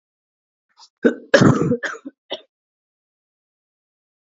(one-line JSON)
{"cough_length": "4.4 s", "cough_amplitude": 28302, "cough_signal_mean_std_ratio": 0.28, "survey_phase": "alpha (2021-03-01 to 2021-08-12)", "age": "18-44", "gender": "Female", "wearing_mask": "No", "symptom_fatigue": true, "smoker_status": "Never smoked", "respiratory_condition_asthma": false, "respiratory_condition_other": false, "recruitment_source": "Test and Trace", "submission_delay": "1 day", "covid_test_result": "Positive", "covid_test_method": "LFT"}